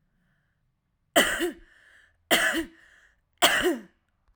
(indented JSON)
{
  "three_cough_length": "4.4 s",
  "three_cough_amplitude": 22723,
  "three_cough_signal_mean_std_ratio": 0.39,
  "survey_phase": "alpha (2021-03-01 to 2021-08-12)",
  "age": "18-44",
  "gender": "Female",
  "wearing_mask": "No",
  "symptom_none": true,
  "smoker_status": "Current smoker (11 or more cigarettes per day)",
  "respiratory_condition_asthma": true,
  "respiratory_condition_other": false,
  "recruitment_source": "REACT",
  "submission_delay": "1 day",
  "covid_test_result": "Negative",
  "covid_test_method": "RT-qPCR"
}